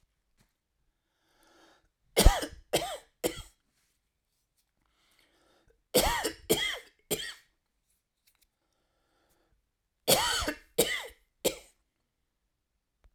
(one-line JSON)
{"three_cough_length": "13.1 s", "three_cough_amplitude": 21823, "three_cough_signal_mean_std_ratio": 0.27, "survey_phase": "alpha (2021-03-01 to 2021-08-12)", "age": "65+", "gender": "Male", "wearing_mask": "No", "symptom_none": true, "smoker_status": "Never smoked", "respiratory_condition_asthma": false, "respiratory_condition_other": false, "recruitment_source": "REACT", "submission_delay": "3 days", "covid_test_result": "Negative", "covid_test_method": "RT-qPCR"}